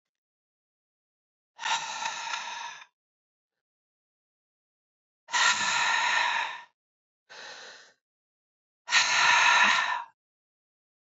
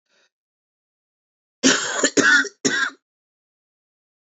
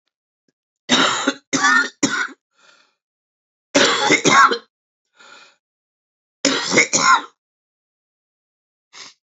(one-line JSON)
{"exhalation_length": "11.2 s", "exhalation_amplitude": 11547, "exhalation_signal_mean_std_ratio": 0.42, "cough_length": "4.3 s", "cough_amplitude": 27318, "cough_signal_mean_std_ratio": 0.36, "three_cough_length": "9.4 s", "three_cough_amplitude": 30665, "three_cough_signal_mean_std_ratio": 0.4, "survey_phase": "beta (2021-08-13 to 2022-03-07)", "age": "65+", "gender": "Male", "wearing_mask": "No", "symptom_cough_any": true, "symptom_new_continuous_cough": true, "symptom_runny_or_blocked_nose": true, "symptom_fatigue": true, "symptom_fever_high_temperature": true, "symptom_headache": true, "smoker_status": "Never smoked", "respiratory_condition_asthma": false, "respiratory_condition_other": false, "recruitment_source": "Test and Trace", "submission_delay": "1 day", "covid_test_result": "Positive", "covid_test_method": "RT-qPCR"}